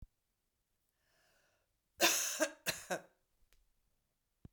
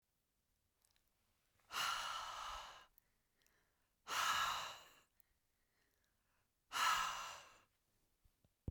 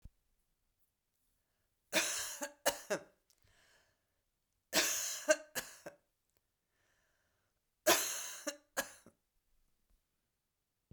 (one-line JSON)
{"cough_length": "4.5 s", "cough_amplitude": 5394, "cough_signal_mean_std_ratio": 0.29, "exhalation_length": "8.7 s", "exhalation_amplitude": 1822, "exhalation_signal_mean_std_ratio": 0.41, "three_cough_length": "10.9 s", "three_cough_amplitude": 7644, "three_cough_signal_mean_std_ratio": 0.3, "survey_phase": "beta (2021-08-13 to 2022-03-07)", "age": "45-64", "gender": "Female", "wearing_mask": "No", "symptom_runny_or_blocked_nose": true, "smoker_status": "Never smoked", "respiratory_condition_asthma": false, "respiratory_condition_other": false, "recruitment_source": "REACT", "submission_delay": "1 day", "covid_test_result": "Negative", "covid_test_method": "RT-qPCR"}